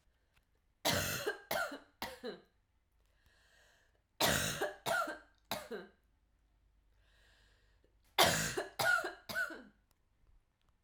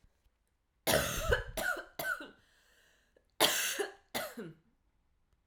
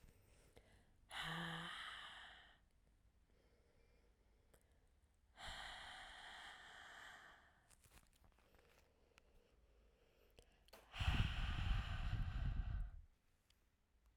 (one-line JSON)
{"three_cough_length": "10.8 s", "three_cough_amplitude": 6705, "three_cough_signal_mean_std_ratio": 0.41, "cough_length": "5.5 s", "cough_amplitude": 13496, "cough_signal_mean_std_ratio": 0.44, "exhalation_length": "14.2 s", "exhalation_amplitude": 1600, "exhalation_signal_mean_std_ratio": 0.45, "survey_phase": "alpha (2021-03-01 to 2021-08-12)", "age": "18-44", "gender": "Female", "wearing_mask": "No", "symptom_cough_any": true, "symptom_fatigue": true, "symptom_onset": "4 days", "smoker_status": "Never smoked", "respiratory_condition_asthma": false, "respiratory_condition_other": false, "recruitment_source": "Test and Trace", "submission_delay": "1 day", "covid_test_result": "Positive", "covid_test_method": "RT-qPCR", "covid_ct_value": 23.9, "covid_ct_gene": "ORF1ab gene", "covid_ct_mean": 24.4, "covid_viral_load": "9900 copies/ml", "covid_viral_load_category": "Minimal viral load (< 10K copies/ml)"}